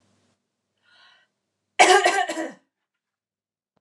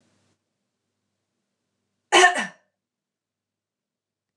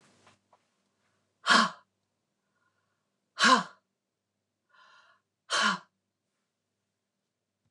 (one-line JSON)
{"three_cough_length": "3.8 s", "three_cough_amplitude": 27701, "three_cough_signal_mean_std_ratio": 0.28, "cough_length": "4.4 s", "cough_amplitude": 27361, "cough_signal_mean_std_ratio": 0.19, "exhalation_length": "7.7 s", "exhalation_amplitude": 13479, "exhalation_signal_mean_std_ratio": 0.23, "survey_phase": "beta (2021-08-13 to 2022-03-07)", "age": "45-64", "gender": "Female", "wearing_mask": "No", "symptom_runny_or_blocked_nose": true, "smoker_status": "Never smoked", "respiratory_condition_asthma": true, "respiratory_condition_other": false, "recruitment_source": "REACT", "submission_delay": "2 days", "covid_test_result": "Negative", "covid_test_method": "RT-qPCR", "influenza_a_test_result": "Unknown/Void", "influenza_b_test_result": "Unknown/Void"}